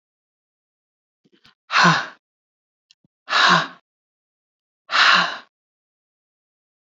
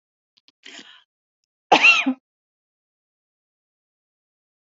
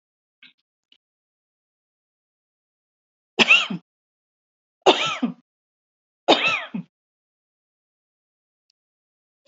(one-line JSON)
{"exhalation_length": "7.0 s", "exhalation_amplitude": 27346, "exhalation_signal_mean_std_ratio": 0.31, "cough_length": "4.8 s", "cough_amplitude": 28421, "cough_signal_mean_std_ratio": 0.22, "three_cough_length": "9.5 s", "three_cough_amplitude": 29429, "three_cough_signal_mean_std_ratio": 0.23, "survey_phase": "beta (2021-08-13 to 2022-03-07)", "age": "45-64", "gender": "Female", "wearing_mask": "No", "symptom_runny_or_blocked_nose": true, "symptom_fatigue": true, "symptom_headache": true, "symptom_onset": "11 days", "smoker_status": "Never smoked", "respiratory_condition_asthma": false, "respiratory_condition_other": false, "recruitment_source": "REACT", "submission_delay": "2 days", "covid_test_result": "Negative", "covid_test_method": "RT-qPCR"}